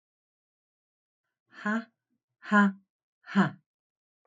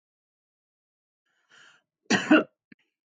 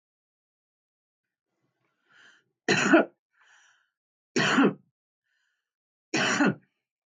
{"exhalation_length": "4.3 s", "exhalation_amplitude": 9400, "exhalation_signal_mean_std_ratio": 0.29, "cough_length": "3.1 s", "cough_amplitude": 14850, "cough_signal_mean_std_ratio": 0.22, "three_cough_length": "7.1 s", "three_cough_amplitude": 14982, "three_cough_signal_mean_std_ratio": 0.31, "survey_phase": "beta (2021-08-13 to 2022-03-07)", "age": "45-64", "gender": "Female", "wearing_mask": "No", "symptom_runny_or_blocked_nose": true, "symptom_onset": "5 days", "smoker_status": "Current smoker (1 to 10 cigarettes per day)", "respiratory_condition_asthma": false, "respiratory_condition_other": false, "recruitment_source": "REACT", "submission_delay": "1 day", "covid_test_result": "Negative", "covid_test_method": "RT-qPCR", "influenza_a_test_result": "Negative", "influenza_b_test_result": "Negative"}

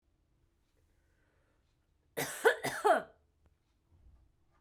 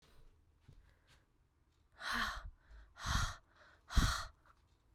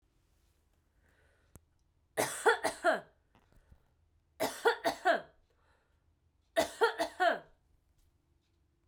{"cough_length": "4.6 s", "cough_amplitude": 7196, "cough_signal_mean_std_ratio": 0.26, "exhalation_length": "4.9 s", "exhalation_amplitude": 4491, "exhalation_signal_mean_std_ratio": 0.37, "three_cough_length": "8.9 s", "three_cough_amplitude": 7031, "three_cough_signal_mean_std_ratio": 0.33, "survey_phase": "beta (2021-08-13 to 2022-03-07)", "age": "18-44", "gender": "Female", "wearing_mask": "Yes", "symptom_shortness_of_breath": true, "symptom_fatigue": true, "symptom_headache": true, "symptom_change_to_sense_of_smell_or_taste": true, "symptom_onset": "3 days", "smoker_status": "Never smoked", "respiratory_condition_asthma": false, "respiratory_condition_other": false, "recruitment_source": "Test and Trace", "submission_delay": "2 days", "covid_test_result": "Positive", "covid_test_method": "RT-qPCR", "covid_ct_value": 14.4, "covid_ct_gene": "N gene", "covid_ct_mean": 15.0, "covid_viral_load": "12000000 copies/ml", "covid_viral_load_category": "High viral load (>1M copies/ml)"}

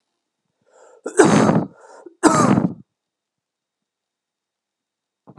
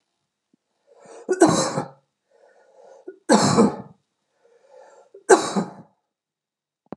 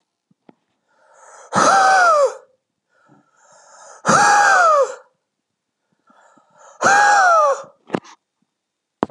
{"cough_length": "5.4 s", "cough_amplitude": 32768, "cough_signal_mean_std_ratio": 0.34, "three_cough_length": "7.0 s", "three_cough_amplitude": 30687, "three_cough_signal_mean_std_ratio": 0.32, "exhalation_length": "9.1 s", "exhalation_amplitude": 32329, "exhalation_signal_mean_std_ratio": 0.47, "survey_phase": "alpha (2021-03-01 to 2021-08-12)", "age": "18-44", "gender": "Male", "wearing_mask": "No", "symptom_none": true, "smoker_status": "Never smoked", "respiratory_condition_asthma": false, "respiratory_condition_other": false, "recruitment_source": "REACT", "submission_delay": "2 days", "covid_test_result": "Negative", "covid_test_method": "RT-qPCR"}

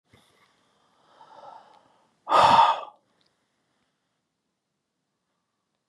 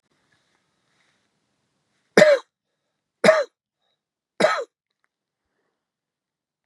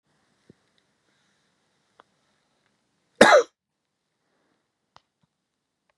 {"exhalation_length": "5.9 s", "exhalation_amplitude": 21170, "exhalation_signal_mean_std_ratio": 0.24, "three_cough_length": "6.7 s", "three_cough_amplitude": 31255, "three_cough_signal_mean_std_ratio": 0.23, "cough_length": "6.0 s", "cough_amplitude": 32768, "cough_signal_mean_std_ratio": 0.15, "survey_phase": "beta (2021-08-13 to 2022-03-07)", "age": "65+", "gender": "Male", "wearing_mask": "No", "symptom_cough_any": true, "symptom_shortness_of_breath": true, "symptom_fatigue": true, "symptom_change_to_sense_of_smell_or_taste": true, "symptom_loss_of_taste": true, "symptom_onset": "5 days", "smoker_status": "Ex-smoker", "respiratory_condition_asthma": false, "respiratory_condition_other": false, "recruitment_source": "Test and Trace", "submission_delay": "2 days", "covid_test_result": "Positive", "covid_test_method": "RT-qPCR", "covid_ct_value": 19.4, "covid_ct_gene": "ORF1ab gene", "covid_ct_mean": 19.7, "covid_viral_load": "330000 copies/ml", "covid_viral_load_category": "Low viral load (10K-1M copies/ml)"}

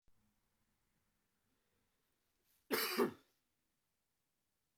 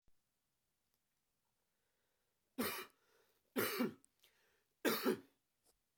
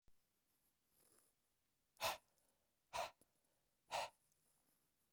{"cough_length": "4.8 s", "cough_amplitude": 2378, "cough_signal_mean_std_ratio": 0.23, "three_cough_length": "6.0 s", "three_cough_amplitude": 2976, "three_cough_signal_mean_std_ratio": 0.31, "exhalation_length": "5.1 s", "exhalation_amplitude": 1153, "exhalation_signal_mean_std_ratio": 0.26, "survey_phase": "beta (2021-08-13 to 2022-03-07)", "age": "18-44", "gender": "Male", "wearing_mask": "No", "symptom_runny_or_blocked_nose": true, "symptom_shortness_of_breath": true, "symptom_fatigue": true, "symptom_headache": true, "symptom_change_to_sense_of_smell_or_taste": true, "symptom_onset": "3 days", "smoker_status": "Never smoked", "respiratory_condition_asthma": false, "respiratory_condition_other": false, "recruitment_source": "Test and Trace", "submission_delay": "2 days", "covid_test_result": "Positive", "covid_test_method": "RT-qPCR"}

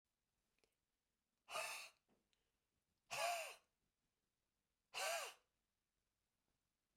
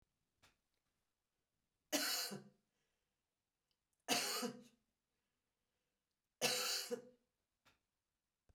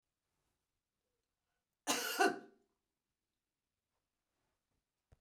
{"exhalation_length": "7.0 s", "exhalation_amplitude": 908, "exhalation_signal_mean_std_ratio": 0.33, "three_cough_length": "8.5 s", "three_cough_amplitude": 2439, "three_cough_signal_mean_std_ratio": 0.33, "cough_length": "5.2 s", "cough_amplitude": 3914, "cough_signal_mean_std_ratio": 0.22, "survey_phase": "beta (2021-08-13 to 2022-03-07)", "age": "65+", "gender": "Female", "wearing_mask": "No", "symptom_none": true, "symptom_onset": "7 days", "smoker_status": "Never smoked", "respiratory_condition_asthma": false, "respiratory_condition_other": false, "recruitment_source": "REACT", "submission_delay": "1 day", "covid_test_result": "Negative", "covid_test_method": "RT-qPCR", "influenza_a_test_result": "Negative", "influenza_b_test_result": "Negative"}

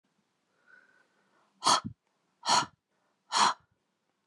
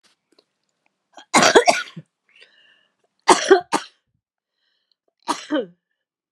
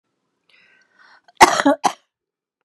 {"exhalation_length": "4.3 s", "exhalation_amplitude": 9727, "exhalation_signal_mean_std_ratio": 0.29, "three_cough_length": "6.3 s", "three_cough_amplitude": 32767, "three_cough_signal_mean_std_ratio": 0.28, "cough_length": "2.6 s", "cough_amplitude": 32768, "cough_signal_mean_std_ratio": 0.25, "survey_phase": "beta (2021-08-13 to 2022-03-07)", "age": "45-64", "gender": "Female", "wearing_mask": "No", "symptom_runny_or_blocked_nose": true, "symptom_change_to_sense_of_smell_or_taste": true, "symptom_onset": "4 days", "smoker_status": "Never smoked", "respiratory_condition_asthma": true, "respiratory_condition_other": false, "recruitment_source": "Test and Trace", "submission_delay": "2 days", "covid_test_result": "Positive", "covid_test_method": "RT-qPCR", "covid_ct_value": 19.1, "covid_ct_gene": "N gene"}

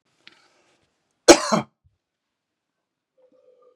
{"cough_length": "3.8 s", "cough_amplitude": 32768, "cough_signal_mean_std_ratio": 0.16, "survey_phase": "beta (2021-08-13 to 2022-03-07)", "age": "45-64", "gender": "Male", "wearing_mask": "No", "symptom_sore_throat": true, "symptom_headache": true, "symptom_other": true, "smoker_status": "Never smoked", "respiratory_condition_asthma": false, "respiratory_condition_other": false, "recruitment_source": "Test and Trace", "submission_delay": "2 days", "covid_test_result": "Positive", "covid_test_method": "RT-qPCR", "covid_ct_value": 19.2, "covid_ct_gene": "ORF1ab gene", "covid_ct_mean": 19.9, "covid_viral_load": "290000 copies/ml", "covid_viral_load_category": "Low viral load (10K-1M copies/ml)"}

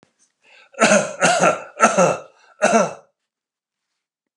{"cough_length": "4.4 s", "cough_amplitude": 32123, "cough_signal_mean_std_ratio": 0.45, "survey_phase": "beta (2021-08-13 to 2022-03-07)", "age": "65+", "gender": "Male", "wearing_mask": "No", "symptom_none": true, "smoker_status": "Ex-smoker", "respiratory_condition_asthma": false, "respiratory_condition_other": false, "recruitment_source": "REACT", "submission_delay": "0 days", "covid_test_result": "Negative", "covid_test_method": "RT-qPCR"}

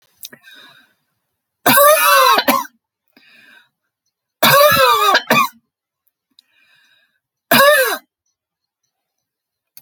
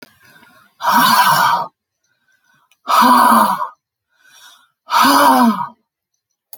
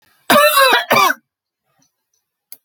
{"three_cough_length": "9.8 s", "three_cough_amplitude": 32768, "three_cough_signal_mean_std_ratio": 0.42, "exhalation_length": "6.6 s", "exhalation_amplitude": 32256, "exhalation_signal_mean_std_ratio": 0.53, "cough_length": "2.6 s", "cough_amplitude": 32768, "cough_signal_mean_std_ratio": 0.46, "survey_phase": "alpha (2021-03-01 to 2021-08-12)", "age": "65+", "gender": "Female", "wearing_mask": "No", "symptom_none": true, "smoker_status": "Never smoked", "respiratory_condition_asthma": false, "respiratory_condition_other": false, "recruitment_source": "REACT", "submission_delay": "2 days", "covid_test_result": "Negative", "covid_test_method": "RT-qPCR"}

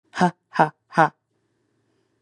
{"exhalation_length": "2.2 s", "exhalation_amplitude": 28933, "exhalation_signal_mean_std_ratio": 0.26, "survey_phase": "beta (2021-08-13 to 2022-03-07)", "age": "18-44", "gender": "Female", "wearing_mask": "No", "symptom_cough_any": true, "symptom_runny_or_blocked_nose": true, "symptom_sore_throat": true, "symptom_onset": "12 days", "smoker_status": "Never smoked", "respiratory_condition_asthma": false, "respiratory_condition_other": false, "recruitment_source": "REACT", "submission_delay": "1 day", "covid_test_result": "Negative", "covid_test_method": "RT-qPCR", "influenza_a_test_result": "Unknown/Void", "influenza_b_test_result": "Unknown/Void"}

